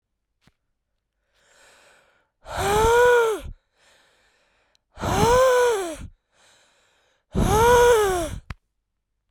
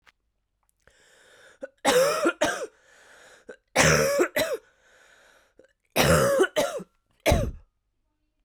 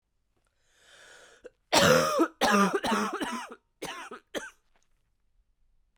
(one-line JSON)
{"exhalation_length": "9.3 s", "exhalation_amplitude": 17648, "exhalation_signal_mean_std_ratio": 0.46, "three_cough_length": "8.4 s", "three_cough_amplitude": 23407, "three_cough_signal_mean_std_ratio": 0.45, "cough_length": "6.0 s", "cough_amplitude": 17464, "cough_signal_mean_std_ratio": 0.42, "survey_phase": "beta (2021-08-13 to 2022-03-07)", "age": "18-44", "gender": "Female", "wearing_mask": "No", "symptom_cough_any": true, "symptom_runny_or_blocked_nose": true, "symptom_shortness_of_breath": true, "symptom_fatigue": true, "symptom_headache": true, "symptom_onset": "3 days", "smoker_status": "Ex-smoker", "respiratory_condition_asthma": false, "respiratory_condition_other": false, "recruitment_source": "Test and Trace", "submission_delay": "2 days", "covid_test_result": "Positive", "covid_test_method": "RT-qPCR", "covid_ct_value": 24.1, "covid_ct_gene": "ORF1ab gene"}